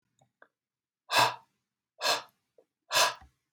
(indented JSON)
{
  "exhalation_length": "3.5 s",
  "exhalation_amplitude": 10442,
  "exhalation_signal_mean_std_ratio": 0.32,
  "survey_phase": "beta (2021-08-13 to 2022-03-07)",
  "age": "18-44",
  "gender": "Male",
  "wearing_mask": "No",
  "symptom_none": true,
  "smoker_status": "Never smoked",
  "respiratory_condition_asthma": false,
  "respiratory_condition_other": false,
  "recruitment_source": "REACT",
  "submission_delay": "0 days",
  "covid_test_result": "Negative",
  "covid_test_method": "RT-qPCR",
  "influenza_a_test_result": "Negative",
  "influenza_b_test_result": "Negative"
}